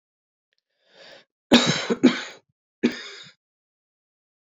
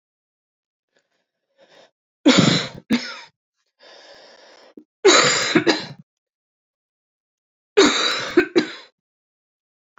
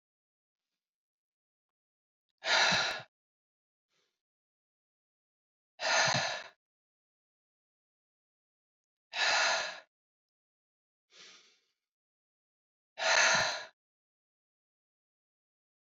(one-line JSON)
{"cough_length": "4.5 s", "cough_amplitude": 28730, "cough_signal_mean_std_ratio": 0.28, "three_cough_length": "10.0 s", "three_cough_amplitude": 29117, "three_cough_signal_mean_std_ratio": 0.34, "exhalation_length": "15.9 s", "exhalation_amplitude": 6457, "exhalation_signal_mean_std_ratio": 0.3, "survey_phase": "beta (2021-08-13 to 2022-03-07)", "age": "45-64", "gender": "Female", "wearing_mask": "No", "symptom_cough_any": true, "symptom_new_continuous_cough": true, "symptom_runny_or_blocked_nose": true, "symptom_sore_throat": true, "symptom_headache": true, "symptom_change_to_sense_of_smell_or_taste": true, "symptom_loss_of_taste": true, "symptom_onset": "6 days", "smoker_status": "Ex-smoker", "respiratory_condition_asthma": false, "respiratory_condition_other": false, "recruitment_source": "Test and Trace", "submission_delay": "1 day", "covid_test_result": "Positive", "covid_test_method": "RT-qPCR"}